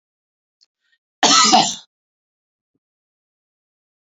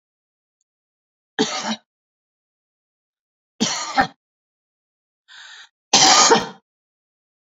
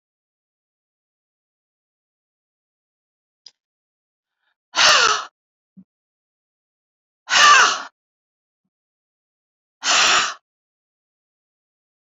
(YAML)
cough_length: 4.0 s
cough_amplitude: 30457
cough_signal_mean_std_ratio: 0.28
three_cough_length: 7.6 s
three_cough_amplitude: 32768
three_cough_signal_mean_std_ratio: 0.29
exhalation_length: 12.0 s
exhalation_amplitude: 31399
exhalation_signal_mean_std_ratio: 0.26
survey_phase: alpha (2021-03-01 to 2021-08-12)
age: 65+
gender: Female
wearing_mask: 'No'
symptom_none: true
smoker_status: Never smoked
respiratory_condition_asthma: false
respiratory_condition_other: false
recruitment_source: REACT
submission_delay: 2 days
covid_test_result: Negative
covid_test_method: RT-qPCR